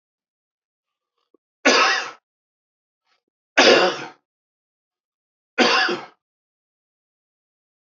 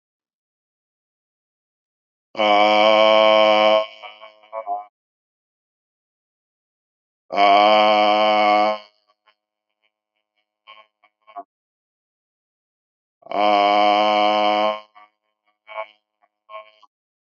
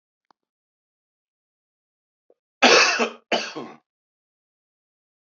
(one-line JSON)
{"three_cough_length": "7.9 s", "three_cough_amplitude": 27619, "three_cough_signal_mean_std_ratio": 0.3, "exhalation_length": "17.2 s", "exhalation_amplitude": 26544, "exhalation_signal_mean_std_ratio": 0.44, "cough_length": "5.2 s", "cough_amplitude": 29098, "cough_signal_mean_std_ratio": 0.26, "survey_phase": "beta (2021-08-13 to 2022-03-07)", "age": "45-64", "gender": "Male", "wearing_mask": "No", "symptom_cough_any": true, "symptom_runny_or_blocked_nose": true, "symptom_sore_throat": true, "symptom_fatigue": true, "symptom_fever_high_temperature": true, "symptom_headache": true, "symptom_onset": "5 days", "smoker_status": "Ex-smoker", "respiratory_condition_asthma": false, "respiratory_condition_other": false, "recruitment_source": "Test and Trace", "submission_delay": "1 day", "covid_test_result": "Positive", "covid_test_method": "ePCR"}